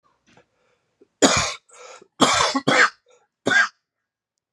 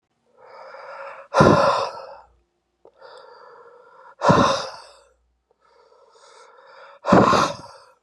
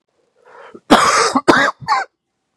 {
  "three_cough_length": "4.5 s",
  "three_cough_amplitude": 31708,
  "three_cough_signal_mean_std_ratio": 0.4,
  "exhalation_length": "8.0 s",
  "exhalation_amplitude": 30997,
  "exhalation_signal_mean_std_ratio": 0.37,
  "cough_length": "2.6 s",
  "cough_amplitude": 32768,
  "cough_signal_mean_std_ratio": 0.48,
  "survey_phase": "beta (2021-08-13 to 2022-03-07)",
  "age": "18-44",
  "gender": "Male",
  "wearing_mask": "No",
  "symptom_cough_any": true,
  "symptom_runny_or_blocked_nose": true,
  "symptom_sore_throat": true,
  "symptom_headache": true,
  "symptom_onset": "3 days",
  "smoker_status": "Ex-smoker",
  "respiratory_condition_asthma": false,
  "respiratory_condition_other": false,
  "recruitment_source": "Test and Trace",
  "submission_delay": "2 days",
  "covid_test_result": "Positive",
  "covid_test_method": "ePCR"
}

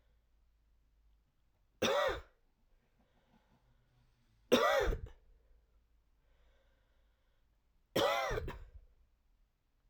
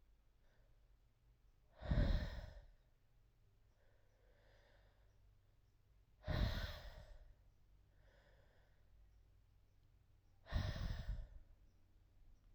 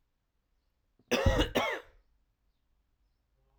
{
  "three_cough_length": "9.9 s",
  "three_cough_amplitude": 6077,
  "three_cough_signal_mean_std_ratio": 0.32,
  "exhalation_length": "12.5 s",
  "exhalation_amplitude": 1619,
  "exhalation_signal_mean_std_ratio": 0.36,
  "cough_length": "3.6 s",
  "cough_amplitude": 6805,
  "cough_signal_mean_std_ratio": 0.32,
  "survey_phase": "alpha (2021-03-01 to 2021-08-12)",
  "age": "18-44",
  "gender": "Male",
  "wearing_mask": "No",
  "symptom_fatigue": true,
  "symptom_headache": true,
  "smoker_status": "Current smoker (e-cigarettes or vapes only)",
  "respiratory_condition_asthma": false,
  "respiratory_condition_other": false,
  "recruitment_source": "Test and Trace",
  "submission_delay": "2 days",
  "covid_test_result": "Positive",
  "covid_test_method": "RT-qPCR",
  "covid_ct_value": 13.4,
  "covid_ct_gene": "ORF1ab gene",
  "covid_ct_mean": 14.1,
  "covid_viral_load": "23000000 copies/ml",
  "covid_viral_load_category": "High viral load (>1M copies/ml)"
}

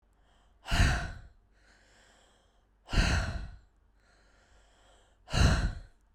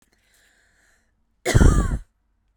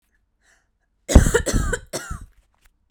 {
  "exhalation_length": "6.1 s",
  "exhalation_amplitude": 8451,
  "exhalation_signal_mean_std_ratio": 0.39,
  "cough_length": "2.6 s",
  "cough_amplitude": 26660,
  "cough_signal_mean_std_ratio": 0.35,
  "three_cough_length": "2.9 s",
  "three_cough_amplitude": 32768,
  "three_cough_signal_mean_std_ratio": 0.32,
  "survey_phase": "beta (2021-08-13 to 2022-03-07)",
  "age": "18-44",
  "gender": "Female",
  "wearing_mask": "No",
  "symptom_none": true,
  "smoker_status": "Never smoked",
  "respiratory_condition_asthma": false,
  "respiratory_condition_other": false,
  "recruitment_source": "REACT",
  "submission_delay": "1 day",
  "covid_test_result": "Negative",
  "covid_test_method": "RT-qPCR"
}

